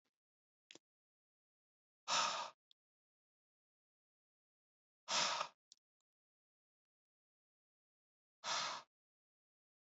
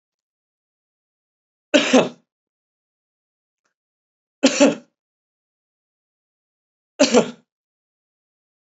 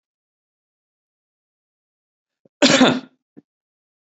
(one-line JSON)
{"exhalation_length": "9.9 s", "exhalation_amplitude": 2056, "exhalation_signal_mean_std_ratio": 0.26, "three_cough_length": "8.7 s", "three_cough_amplitude": 32768, "three_cough_signal_mean_std_ratio": 0.22, "cough_length": "4.1 s", "cough_amplitude": 28373, "cough_signal_mean_std_ratio": 0.22, "survey_phase": "beta (2021-08-13 to 2022-03-07)", "age": "45-64", "gender": "Male", "wearing_mask": "No", "symptom_cough_any": true, "symptom_runny_or_blocked_nose": true, "symptom_sore_throat": true, "symptom_onset": "5 days", "smoker_status": "Never smoked", "respiratory_condition_asthma": false, "respiratory_condition_other": false, "recruitment_source": "Test and Trace", "submission_delay": "1 day", "covid_test_result": "Positive", "covid_test_method": "ePCR"}